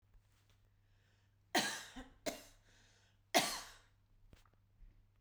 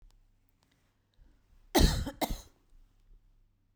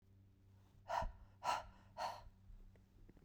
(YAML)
three_cough_length: 5.2 s
three_cough_amplitude: 4071
three_cough_signal_mean_std_ratio: 0.29
cough_length: 3.8 s
cough_amplitude: 11770
cough_signal_mean_std_ratio: 0.27
exhalation_length: 3.2 s
exhalation_amplitude: 1561
exhalation_signal_mean_std_ratio: 0.47
survey_phase: beta (2021-08-13 to 2022-03-07)
age: 45-64
gender: Female
wearing_mask: 'No'
symptom_none: true
smoker_status: Ex-smoker
respiratory_condition_asthma: false
respiratory_condition_other: false
recruitment_source: REACT
submission_delay: 9 days
covid_test_result: Negative
covid_test_method: RT-qPCR